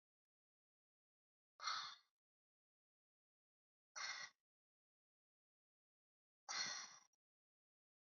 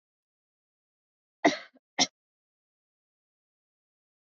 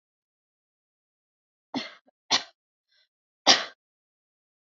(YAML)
exhalation_length: 8.0 s
exhalation_amplitude: 839
exhalation_signal_mean_std_ratio: 0.28
cough_length: 4.3 s
cough_amplitude: 10897
cough_signal_mean_std_ratio: 0.15
three_cough_length: 4.8 s
three_cough_amplitude: 27985
three_cough_signal_mean_std_ratio: 0.18
survey_phase: alpha (2021-03-01 to 2021-08-12)
age: 18-44
gender: Female
wearing_mask: 'No'
symptom_fatigue: true
symptom_onset: 12 days
smoker_status: Never smoked
respiratory_condition_asthma: false
respiratory_condition_other: false
recruitment_source: REACT
submission_delay: 1 day
covid_test_result: Negative
covid_test_method: RT-qPCR